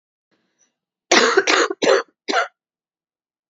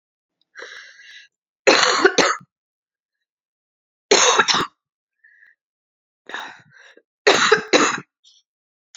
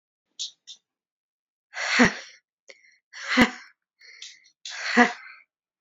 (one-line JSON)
{"cough_length": "3.5 s", "cough_amplitude": 31939, "cough_signal_mean_std_ratio": 0.4, "three_cough_length": "9.0 s", "three_cough_amplitude": 32768, "three_cough_signal_mean_std_ratio": 0.35, "exhalation_length": "5.8 s", "exhalation_amplitude": 27425, "exhalation_signal_mean_std_ratio": 0.3, "survey_phase": "beta (2021-08-13 to 2022-03-07)", "age": "18-44", "gender": "Female", "wearing_mask": "No", "symptom_cough_any": true, "symptom_new_continuous_cough": true, "symptom_runny_or_blocked_nose": true, "symptom_shortness_of_breath": true, "symptom_sore_throat": true, "symptom_fatigue": true, "symptom_fever_high_temperature": true, "symptom_headache": true, "symptom_onset": "3 days", "smoker_status": "Current smoker (e-cigarettes or vapes only)", "respiratory_condition_asthma": false, "respiratory_condition_other": false, "recruitment_source": "Test and Trace", "submission_delay": "2 days", "covid_test_result": "Positive", "covid_test_method": "RT-qPCR", "covid_ct_value": 21.2, "covid_ct_gene": "ORF1ab gene", "covid_ct_mean": 21.7, "covid_viral_load": "74000 copies/ml", "covid_viral_load_category": "Low viral load (10K-1M copies/ml)"}